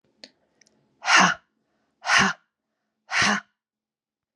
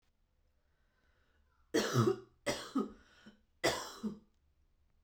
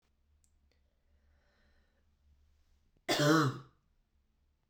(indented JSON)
{
  "exhalation_length": "4.4 s",
  "exhalation_amplitude": 19998,
  "exhalation_signal_mean_std_ratio": 0.34,
  "three_cough_length": "5.0 s",
  "three_cough_amplitude": 4942,
  "three_cough_signal_mean_std_ratio": 0.36,
  "cough_length": "4.7 s",
  "cough_amplitude": 5568,
  "cough_signal_mean_std_ratio": 0.27,
  "survey_phase": "beta (2021-08-13 to 2022-03-07)",
  "age": "18-44",
  "gender": "Female",
  "wearing_mask": "No",
  "symptom_cough_any": true,
  "symptom_new_continuous_cough": true,
  "symptom_runny_or_blocked_nose": true,
  "symptom_sore_throat": true,
  "symptom_abdominal_pain": true,
  "symptom_fatigue": true,
  "smoker_status": "Ex-smoker",
  "respiratory_condition_asthma": false,
  "respiratory_condition_other": false,
  "recruitment_source": "Test and Trace",
  "submission_delay": "1 day",
  "covid_test_result": "Positive",
  "covid_test_method": "RT-qPCR",
  "covid_ct_value": 27.4,
  "covid_ct_gene": "N gene"
}